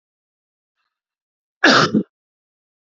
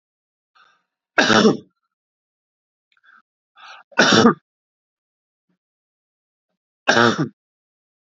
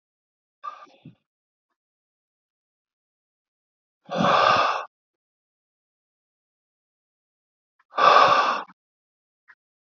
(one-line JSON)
{"cough_length": "2.9 s", "cough_amplitude": 29580, "cough_signal_mean_std_ratio": 0.27, "three_cough_length": "8.2 s", "three_cough_amplitude": 32767, "three_cough_signal_mean_std_ratio": 0.28, "exhalation_length": "9.8 s", "exhalation_amplitude": 24289, "exhalation_signal_mean_std_ratio": 0.29, "survey_phase": "beta (2021-08-13 to 2022-03-07)", "age": "18-44", "gender": "Male", "wearing_mask": "No", "symptom_runny_or_blocked_nose": true, "symptom_onset": "12 days", "smoker_status": "Never smoked", "respiratory_condition_asthma": false, "respiratory_condition_other": false, "recruitment_source": "REACT", "submission_delay": "1 day", "covid_test_result": "Negative", "covid_test_method": "RT-qPCR", "influenza_a_test_result": "Negative", "influenza_b_test_result": "Negative"}